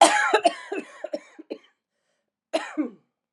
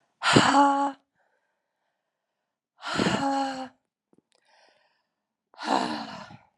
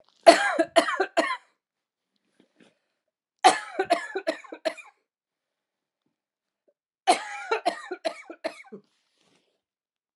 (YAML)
cough_length: 3.3 s
cough_amplitude: 28946
cough_signal_mean_std_ratio: 0.37
exhalation_length: 6.6 s
exhalation_amplitude: 23017
exhalation_signal_mean_std_ratio: 0.4
three_cough_length: 10.2 s
three_cough_amplitude: 29652
three_cough_signal_mean_std_ratio: 0.28
survey_phase: alpha (2021-03-01 to 2021-08-12)
age: 45-64
gender: Female
wearing_mask: 'No'
symptom_cough_any: true
symptom_fatigue: true
symptom_onset: 5 days
smoker_status: Never smoked
respiratory_condition_asthma: false
respiratory_condition_other: false
recruitment_source: Test and Trace
submission_delay: 2 days
covid_test_result: Positive
covid_test_method: RT-qPCR
covid_ct_value: 21.2
covid_ct_gene: ORF1ab gene
covid_ct_mean: 21.5
covid_viral_load: 90000 copies/ml
covid_viral_load_category: Low viral load (10K-1M copies/ml)